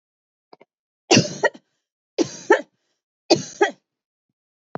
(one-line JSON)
{"three_cough_length": "4.8 s", "three_cough_amplitude": 28775, "three_cough_signal_mean_std_ratio": 0.27, "survey_phase": "beta (2021-08-13 to 2022-03-07)", "age": "45-64", "gender": "Female", "wearing_mask": "No", "symptom_cough_any": true, "symptom_runny_or_blocked_nose": true, "symptom_onset": "5 days", "smoker_status": "Never smoked", "respiratory_condition_asthma": true, "respiratory_condition_other": false, "recruitment_source": "Test and Trace", "submission_delay": "1 day", "covid_test_result": "Positive", "covid_test_method": "RT-qPCR", "covid_ct_value": 17.1, "covid_ct_gene": "ORF1ab gene", "covid_ct_mean": 18.5, "covid_viral_load": "860000 copies/ml", "covid_viral_load_category": "Low viral load (10K-1M copies/ml)"}